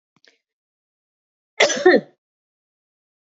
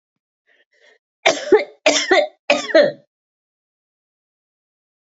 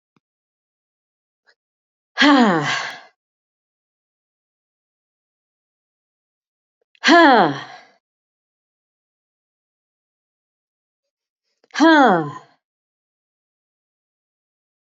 {"cough_length": "3.2 s", "cough_amplitude": 28165, "cough_signal_mean_std_ratio": 0.24, "three_cough_length": "5.0 s", "three_cough_amplitude": 32767, "three_cough_signal_mean_std_ratio": 0.34, "exhalation_length": "14.9 s", "exhalation_amplitude": 29483, "exhalation_signal_mean_std_ratio": 0.26, "survey_phase": "beta (2021-08-13 to 2022-03-07)", "age": "65+", "gender": "Female", "wearing_mask": "No", "symptom_none": true, "smoker_status": "Ex-smoker", "respiratory_condition_asthma": false, "respiratory_condition_other": false, "recruitment_source": "REACT", "submission_delay": "3 days", "covid_test_result": "Negative", "covid_test_method": "RT-qPCR"}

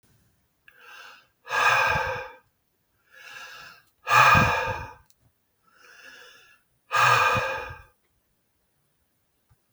{"exhalation_length": "9.7 s", "exhalation_amplitude": 21472, "exhalation_signal_mean_std_ratio": 0.39, "survey_phase": "beta (2021-08-13 to 2022-03-07)", "age": "45-64", "gender": "Male", "wearing_mask": "No", "symptom_none": true, "smoker_status": "Ex-smoker", "respiratory_condition_asthma": false, "respiratory_condition_other": false, "recruitment_source": "REACT", "submission_delay": "4 days", "covid_test_result": "Negative", "covid_test_method": "RT-qPCR", "influenza_a_test_result": "Negative", "influenza_b_test_result": "Negative"}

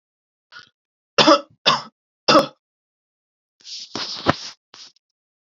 {"three_cough_length": "5.5 s", "three_cough_amplitude": 32373, "three_cough_signal_mean_std_ratio": 0.28, "survey_phase": "beta (2021-08-13 to 2022-03-07)", "age": "18-44", "gender": "Male", "wearing_mask": "No", "symptom_none": true, "smoker_status": "Never smoked", "respiratory_condition_asthma": true, "respiratory_condition_other": false, "recruitment_source": "REACT", "submission_delay": "1 day", "covid_test_result": "Negative", "covid_test_method": "RT-qPCR", "influenza_a_test_result": "Negative", "influenza_b_test_result": "Negative"}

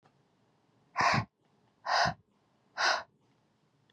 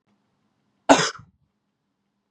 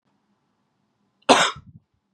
{"exhalation_length": "3.9 s", "exhalation_amplitude": 5738, "exhalation_signal_mean_std_ratio": 0.37, "cough_length": "2.3 s", "cough_amplitude": 32767, "cough_signal_mean_std_ratio": 0.2, "three_cough_length": "2.1 s", "three_cough_amplitude": 31660, "three_cough_signal_mean_std_ratio": 0.24, "survey_phase": "beta (2021-08-13 to 2022-03-07)", "age": "18-44", "gender": "Male", "wearing_mask": "No", "symptom_none": true, "symptom_onset": "2 days", "smoker_status": "Never smoked", "respiratory_condition_asthma": false, "respiratory_condition_other": false, "recruitment_source": "REACT", "submission_delay": "6 days", "covid_test_result": "Negative", "covid_test_method": "RT-qPCR", "influenza_a_test_result": "Negative", "influenza_b_test_result": "Negative"}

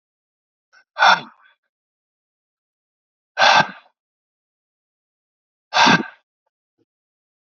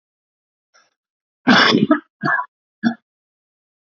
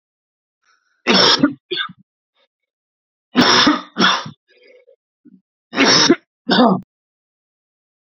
{"exhalation_length": "7.6 s", "exhalation_amplitude": 28733, "exhalation_signal_mean_std_ratio": 0.25, "cough_length": "3.9 s", "cough_amplitude": 30509, "cough_signal_mean_std_ratio": 0.34, "three_cough_length": "8.1 s", "three_cough_amplitude": 32767, "three_cough_signal_mean_std_ratio": 0.4, "survey_phase": "beta (2021-08-13 to 2022-03-07)", "age": "18-44", "gender": "Male", "wearing_mask": "No", "symptom_cough_any": true, "symptom_runny_or_blocked_nose": true, "symptom_sore_throat": true, "symptom_headache": true, "symptom_change_to_sense_of_smell_or_taste": true, "symptom_onset": "4 days", "smoker_status": "Never smoked", "respiratory_condition_asthma": false, "respiratory_condition_other": false, "recruitment_source": "Test and Trace", "submission_delay": "2 days", "covid_test_result": "Positive", "covid_test_method": "RT-qPCR", "covid_ct_value": 21.0, "covid_ct_gene": "ORF1ab gene"}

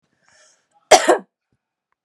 {"cough_length": "2.0 s", "cough_amplitude": 32768, "cough_signal_mean_std_ratio": 0.24, "survey_phase": "beta (2021-08-13 to 2022-03-07)", "age": "18-44", "gender": "Female", "wearing_mask": "No", "symptom_cough_any": true, "symptom_runny_or_blocked_nose": true, "symptom_abdominal_pain": true, "symptom_fatigue": true, "symptom_change_to_sense_of_smell_or_taste": true, "symptom_loss_of_taste": true, "symptom_onset": "3 days", "smoker_status": "Never smoked", "respiratory_condition_asthma": false, "respiratory_condition_other": false, "recruitment_source": "Test and Trace", "submission_delay": "1 day", "covid_test_result": "Positive", "covid_test_method": "RT-qPCR"}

